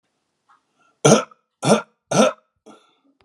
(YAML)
three_cough_length: 3.2 s
three_cough_amplitude: 32768
three_cough_signal_mean_std_ratio: 0.31
survey_phase: alpha (2021-03-01 to 2021-08-12)
age: 65+
gender: Male
wearing_mask: 'No'
symptom_none: true
smoker_status: Ex-smoker
respiratory_condition_asthma: false
respiratory_condition_other: false
recruitment_source: REACT
submission_delay: 2 days
covid_test_result: Negative
covid_test_method: RT-qPCR